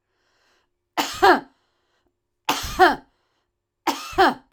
{"three_cough_length": "4.5 s", "three_cough_amplitude": 23752, "three_cough_signal_mean_std_ratio": 0.34, "survey_phase": "alpha (2021-03-01 to 2021-08-12)", "age": "45-64", "gender": "Female", "wearing_mask": "No", "symptom_none": true, "smoker_status": "Ex-smoker", "respiratory_condition_asthma": true, "respiratory_condition_other": false, "recruitment_source": "REACT", "submission_delay": "1 day", "covid_test_result": "Negative", "covid_test_method": "RT-qPCR"}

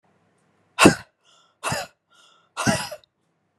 {"exhalation_length": "3.6 s", "exhalation_amplitude": 32767, "exhalation_signal_mean_std_ratio": 0.27, "survey_phase": "beta (2021-08-13 to 2022-03-07)", "age": "18-44", "gender": "Female", "wearing_mask": "No", "symptom_cough_any": true, "symptom_new_continuous_cough": true, "symptom_runny_or_blocked_nose": true, "symptom_fatigue": true, "symptom_headache": true, "symptom_onset": "4 days", "smoker_status": "Never smoked", "respiratory_condition_asthma": false, "respiratory_condition_other": false, "recruitment_source": "Test and Trace", "submission_delay": "3 days", "covid_test_result": "Positive", "covid_test_method": "RT-qPCR"}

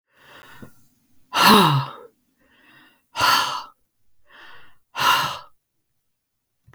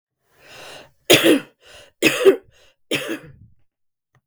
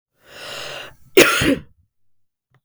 {"exhalation_length": "6.7 s", "exhalation_amplitude": 32767, "exhalation_signal_mean_std_ratio": 0.36, "three_cough_length": "4.3 s", "three_cough_amplitude": 32768, "three_cough_signal_mean_std_ratio": 0.33, "cough_length": "2.6 s", "cough_amplitude": 32768, "cough_signal_mean_std_ratio": 0.34, "survey_phase": "beta (2021-08-13 to 2022-03-07)", "age": "45-64", "gender": "Female", "wearing_mask": "No", "symptom_cough_any": true, "symptom_runny_or_blocked_nose": true, "smoker_status": "Never smoked", "respiratory_condition_asthma": true, "respiratory_condition_other": false, "recruitment_source": "Test and Trace", "submission_delay": "1 day", "covid_test_result": "Positive", "covid_test_method": "ePCR"}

